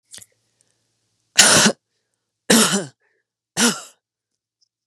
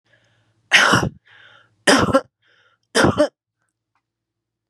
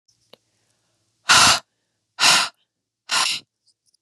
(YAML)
three_cough_length: 4.9 s
three_cough_amplitude: 32768
three_cough_signal_mean_std_ratio: 0.33
cough_length: 4.7 s
cough_amplitude: 32167
cough_signal_mean_std_ratio: 0.36
exhalation_length: 4.0 s
exhalation_amplitude: 29538
exhalation_signal_mean_std_ratio: 0.35
survey_phase: beta (2021-08-13 to 2022-03-07)
age: 45-64
gender: Female
wearing_mask: 'No'
symptom_runny_or_blocked_nose: true
symptom_sore_throat: true
symptom_onset: 3 days
smoker_status: Current smoker (11 or more cigarettes per day)
respiratory_condition_asthma: false
respiratory_condition_other: false
recruitment_source: Test and Trace
submission_delay: 3 days
covid_test_result: Positive
covid_test_method: RT-qPCR
covid_ct_value: 27.4
covid_ct_gene: N gene